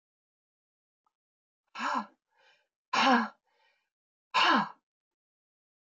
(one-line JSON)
{"exhalation_length": "5.9 s", "exhalation_amplitude": 7711, "exhalation_signal_mean_std_ratio": 0.31, "survey_phase": "beta (2021-08-13 to 2022-03-07)", "age": "65+", "gender": "Female", "wearing_mask": "No", "symptom_none": true, "smoker_status": "Current smoker (1 to 10 cigarettes per day)", "respiratory_condition_asthma": false, "respiratory_condition_other": false, "recruitment_source": "REACT", "submission_delay": "4 days", "covid_test_result": "Negative", "covid_test_method": "RT-qPCR", "influenza_a_test_result": "Unknown/Void", "influenza_b_test_result": "Unknown/Void"}